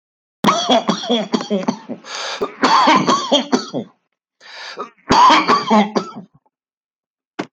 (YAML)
three_cough_length: 7.5 s
three_cough_amplitude: 30699
three_cough_signal_mean_std_ratio: 0.55
survey_phase: beta (2021-08-13 to 2022-03-07)
age: 45-64
gender: Male
wearing_mask: 'No'
symptom_cough_any: true
symptom_runny_or_blocked_nose: true
symptom_shortness_of_breath: true
symptom_sore_throat: true
symptom_fatigue: true
symptom_fever_high_temperature: true
symptom_headache: true
smoker_status: Never smoked
respiratory_condition_asthma: false
respiratory_condition_other: false
recruitment_source: Test and Trace
submission_delay: 1 day
covid_test_result: Positive
covid_test_method: RT-qPCR